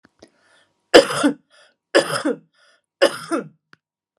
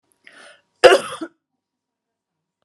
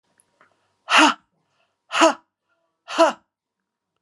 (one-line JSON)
{"three_cough_length": "4.2 s", "three_cough_amplitude": 32768, "three_cough_signal_mean_std_ratio": 0.31, "cough_length": "2.6 s", "cough_amplitude": 32768, "cough_signal_mean_std_ratio": 0.21, "exhalation_length": "4.0 s", "exhalation_amplitude": 28142, "exhalation_signal_mean_std_ratio": 0.3, "survey_phase": "alpha (2021-03-01 to 2021-08-12)", "age": "45-64", "gender": "Female", "wearing_mask": "No", "symptom_none": true, "smoker_status": "Never smoked", "respiratory_condition_asthma": false, "respiratory_condition_other": false, "recruitment_source": "REACT", "submission_delay": "2 days", "covid_test_result": "Negative", "covid_test_method": "RT-qPCR"}